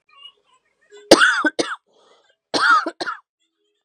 {"cough_length": "3.8 s", "cough_amplitude": 32768, "cough_signal_mean_std_ratio": 0.36, "survey_phase": "beta (2021-08-13 to 2022-03-07)", "age": "18-44", "gender": "Female", "wearing_mask": "No", "symptom_cough_any": true, "symptom_runny_or_blocked_nose": true, "symptom_sore_throat": true, "symptom_fatigue": true, "symptom_fever_high_temperature": true, "symptom_headache": true, "symptom_onset": "2 days", "smoker_status": "Never smoked", "respiratory_condition_asthma": false, "respiratory_condition_other": false, "recruitment_source": "Test and Trace", "submission_delay": "1 day", "covid_test_result": "Positive", "covid_test_method": "ePCR"}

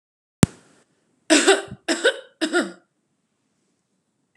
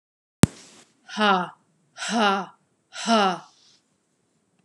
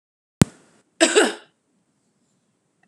{"three_cough_length": "4.4 s", "three_cough_amplitude": 32767, "three_cough_signal_mean_std_ratio": 0.3, "exhalation_length": "4.6 s", "exhalation_amplitude": 32767, "exhalation_signal_mean_std_ratio": 0.35, "cough_length": "2.9 s", "cough_amplitude": 32767, "cough_signal_mean_std_ratio": 0.24, "survey_phase": "beta (2021-08-13 to 2022-03-07)", "age": "18-44", "gender": "Female", "wearing_mask": "No", "symptom_none": true, "smoker_status": "Never smoked", "respiratory_condition_asthma": false, "respiratory_condition_other": false, "recruitment_source": "REACT", "submission_delay": "1 day", "covid_test_result": "Negative", "covid_test_method": "RT-qPCR", "influenza_a_test_result": "Negative", "influenza_b_test_result": "Negative"}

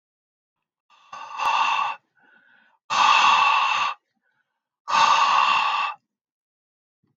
{"exhalation_length": "7.2 s", "exhalation_amplitude": 18690, "exhalation_signal_mean_std_ratio": 0.53, "survey_phase": "alpha (2021-03-01 to 2021-08-12)", "age": "65+", "gender": "Male", "wearing_mask": "No", "symptom_none": true, "smoker_status": "Never smoked", "respiratory_condition_asthma": false, "respiratory_condition_other": false, "recruitment_source": "REACT", "submission_delay": "1 day", "covid_test_result": "Negative", "covid_test_method": "RT-qPCR"}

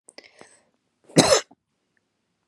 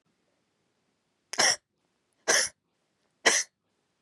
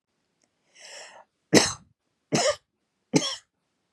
{"cough_length": "2.5 s", "cough_amplitude": 32647, "cough_signal_mean_std_ratio": 0.23, "exhalation_length": "4.0 s", "exhalation_amplitude": 18244, "exhalation_signal_mean_std_ratio": 0.29, "three_cough_length": "3.9 s", "three_cough_amplitude": 27227, "three_cough_signal_mean_std_ratio": 0.29, "survey_phase": "beta (2021-08-13 to 2022-03-07)", "age": "18-44", "gender": "Female", "wearing_mask": "No", "symptom_fatigue": true, "symptom_onset": "8 days", "smoker_status": "Never smoked", "respiratory_condition_asthma": true, "respiratory_condition_other": false, "recruitment_source": "REACT", "submission_delay": "2 days", "covid_test_result": "Negative", "covid_test_method": "RT-qPCR", "influenza_a_test_result": "Negative", "influenza_b_test_result": "Negative"}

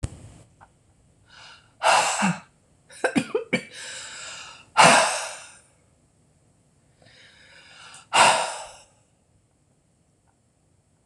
{"exhalation_length": "11.1 s", "exhalation_amplitude": 26028, "exhalation_signal_mean_std_ratio": 0.33, "survey_phase": "beta (2021-08-13 to 2022-03-07)", "age": "45-64", "gender": "Female", "wearing_mask": "No", "symptom_cough_any": true, "symptom_runny_or_blocked_nose": true, "symptom_onset": "11 days", "smoker_status": "Never smoked", "respiratory_condition_asthma": false, "respiratory_condition_other": false, "recruitment_source": "REACT", "submission_delay": "3 days", "covid_test_result": "Negative", "covid_test_method": "RT-qPCR", "influenza_a_test_result": "Negative", "influenza_b_test_result": "Negative"}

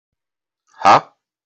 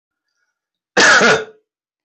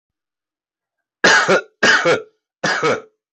{"exhalation_length": "1.5 s", "exhalation_amplitude": 32657, "exhalation_signal_mean_std_ratio": 0.27, "cough_length": "2.0 s", "cough_amplitude": 32661, "cough_signal_mean_std_ratio": 0.41, "three_cough_length": "3.3 s", "three_cough_amplitude": 32327, "three_cough_signal_mean_std_ratio": 0.47, "survey_phase": "beta (2021-08-13 to 2022-03-07)", "age": "18-44", "gender": "Male", "wearing_mask": "No", "symptom_none": true, "smoker_status": "Current smoker (11 or more cigarettes per day)", "respiratory_condition_asthma": false, "respiratory_condition_other": false, "recruitment_source": "REACT", "submission_delay": "1 day", "covid_test_result": "Negative", "covid_test_method": "RT-qPCR", "influenza_a_test_result": "Negative", "influenza_b_test_result": "Negative"}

